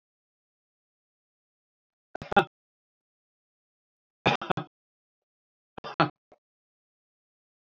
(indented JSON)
{
  "three_cough_length": "7.7 s",
  "three_cough_amplitude": 20644,
  "three_cough_signal_mean_std_ratio": 0.16,
  "survey_phase": "beta (2021-08-13 to 2022-03-07)",
  "age": "65+",
  "gender": "Male",
  "wearing_mask": "No",
  "symptom_none": true,
  "smoker_status": "Never smoked",
  "respiratory_condition_asthma": true,
  "respiratory_condition_other": false,
  "recruitment_source": "REACT",
  "submission_delay": "1 day",
  "covid_test_result": "Negative",
  "covid_test_method": "RT-qPCR",
  "influenza_a_test_result": "Negative",
  "influenza_b_test_result": "Negative"
}